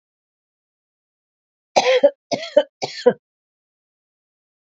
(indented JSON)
{
  "cough_length": "4.6 s",
  "cough_amplitude": 27525,
  "cough_signal_mean_std_ratio": 0.27,
  "survey_phase": "alpha (2021-03-01 to 2021-08-12)",
  "age": "45-64",
  "gender": "Female",
  "wearing_mask": "No",
  "symptom_shortness_of_breath": true,
  "smoker_status": "Prefer not to say",
  "recruitment_source": "REACT",
  "submission_delay": "1 day",
  "covid_test_result": "Negative",
  "covid_test_method": "RT-qPCR"
}